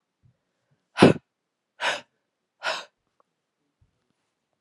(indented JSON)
{
  "exhalation_length": "4.6 s",
  "exhalation_amplitude": 31477,
  "exhalation_signal_mean_std_ratio": 0.19,
  "survey_phase": "beta (2021-08-13 to 2022-03-07)",
  "age": "18-44",
  "gender": "Female",
  "wearing_mask": "No",
  "symptom_fatigue": true,
  "symptom_fever_high_temperature": true,
  "symptom_headache": true,
  "symptom_onset": "3 days",
  "smoker_status": "Never smoked",
  "respiratory_condition_asthma": false,
  "respiratory_condition_other": false,
  "recruitment_source": "Test and Trace",
  "submission_delay": "2 days",
  "covid_test_result": "Positive",
  "covid_test_method": "RT-qPCR",
  "covid_ct_value": 28.9,
  "covid_ct_gene": "N gene"
}